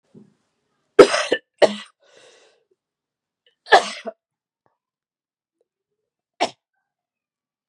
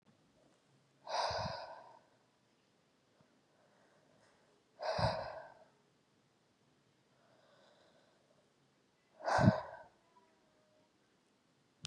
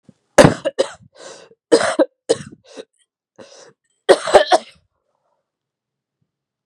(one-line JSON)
{"three_cough_length": "7.7 s", "three_cough_amplitude": 32768, "three_cough_signal_mean_std_ratio": 0.19, "exhalation_length": "11.9 s", "exhalation_amplitude": 6986, "exhalation_signal_mean_std_ratio": 0.27, "cough_length": "6.7 s", "cough_amplitude": 32768, "cough_signal_mean_std_ratio": 0.28, "survey_phase": "beta (2021-08-13 to 2022-03-07)", "age": "18-44", "gender": "Female", "wearing_mask": "No", "symptom_cough_any": true, "symptom_runny_or_blocked_nose": true, "symptom_fatigue": true, "symptom_fever_high_temperature": true, "symptom_other": true, "symptom_onset": "3 days", "smoker_status": "Current smoker (11 or more cigarettes per day)", "respiratory_condition_asthma": false, "respiratory_condition_other": false, "recruitment_source": "Test and Trace", "submission_delay": "1 day", "covid_test_result": "Positive", "covid_test_method": "RT-qPCR", "covid_ct_value": 21.5, "covid_ct_gene": "ORF1ab gene"}